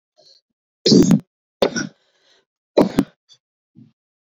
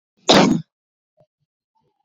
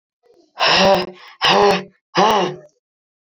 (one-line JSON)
{"three_cough_length": "4.3 s", "three_cough_amplitude": 27288, "three_cough_signal_mean_std_ratio": 0.3, "cough_length": "2.0 s", "cough_amplitude": 31713, "cough_signal_mean_std_ratio": 0.31, "exhalation_length": "3.3 s", "exhalation_amplitude": 27334, "exhalation_signal_mean_std_ratio": 0.52, "survey_phase": "beta (2021-08-13 to 2022-03-07)", "age": "18-44", "gender": "Female", "wearing_mask": "No", "symptom_cough_any": true, "symptom_new_continuous_cough": true, "symptom_shortness_of_breath": true, "symptom_sore_throat": true, "symptom_fatigue": true, "symptom_headache": true, "symptom_change_to_sense_of_smell_or_taste": true, "smoker_status": "Current smoker (1 to 10 cigarettes per day)", "respiratory_condition_asthma": true, "respiratory_condition_other": false, "recruitment_source": "Test and Trace", "submission_delay": "1 day", "covid_test_result": "Positive", "covid_test_method": "RT-qPCR"}